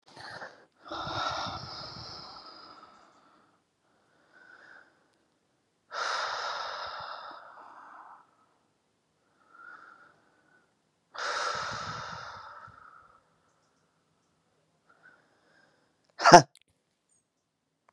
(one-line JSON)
{"exhalation_length": "17.9 s", "exhalation_amplitude": 32767, "exhalation_signal_mean_std_ratio": 0.21, "survey_phase": "beta (2021-08-13 to 2022-03-07)", "age": "45-64", "gender": "Female", "wearing_mask": "No", "symptom_none": true, "smoker_status": "Current smoker (1 to 10 cigarettes per day)", "respiratory_condition_asthma": false, "respiratory_condition_other": false, "recruitment_source": "REACT", "submission_delay": "3 days", "covid_test_result": "Negative", "covid_test_method": "RT-qPCR"}